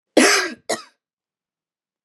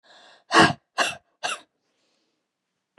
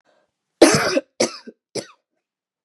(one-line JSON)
{"cough_length": "2.0 s", "cough_amplitude": 29885, "cough_signal_mean_std_ratio": 0.34, "exhalation_length": "3.0 s", "exhalation_amplitude": 28027, "exhalation_signal_mean_std_ratio": 0.27, "three_cough_length": "2.6 s", "three_cough_amplitude": 32767, "three_cough_signal_mean_std_ratio": 0.31, "survey_phase": "beta (2021-08-13 to 2022-03-07)", "age": "18-44", "gender": "Female", "wearing_mask": "No", "symptom_cough_any": true, "symptom_new_continuous_cough": true, "symptom_sore_throat": true, "symptom_abdominal_pain": true, "symptom_diarrhoea": true, "symptom_fatigue": true, "symptom_headache": true, "smoker_status": "Never smoked", "respiratory_condition_asthma": true, "respiratory_condition_other": false, "recruitment_source": "Test and Trace", "submission_delay": "2 days", "covid_test_result": "Positive", "covid_test_method": "RT-qPCR", "covid_ct_value": 21.5, "covid_ct_gene": "N gene"}